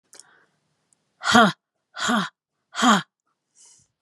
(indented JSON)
{
  "exhalation_length": "4.0 s",
  "exhalation_amplitude": 29767,
  "exhalation_signal_mean_std_ratio": 0.33,
  "survey_phase": "alpha (2021-03-01 to 2021-08-12)",
  "age": "45-64",
  "gender": "Female",
  "wearing_mask": "No",
  "symptom_none": true,
  "smoker_status": "Never smoked",
  "respiratory_condition_asthma": false,
  "respiratory_condition_other": false,
  "recruitment_source": "REACT",
  "submission_delay": "5 days",
  "covid_test_result": "Negative",
  "covid_test_method": "RT-qPCR"
}